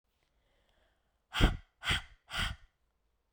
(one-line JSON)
{"exhalation_length": "3.3 s", "exhalation_amplitude": 9438, "exhalation_signal_mean_std_ratio": 0.3, "survey_phase": "beta (2021-08-13 to 2022-03-07)", "age": "18-44", "gender": "Female", "wearing_mask": "No", "symptom_cough_any": true, "symptom_new_continuous_cough": true, "symptom_runny_or_blocked_nose": true, "symptom_sore_throat": true, "symptom_fever_high_temperature": true, "symptom_headache": true, "symptom_onset": "4 days", "smoker_status": "Never smoked", "respiratory_condition_asthma": false, "respiratory_condition_other": false, "recruitment_source": "Test and Trace", "submission_delay": "2 days", "covid_test_result": "Positive", "covid_test_method": "RT-qPCR", "covid_ct_value": 19.1, "covid_ct_gene": "ORF1ab gene"}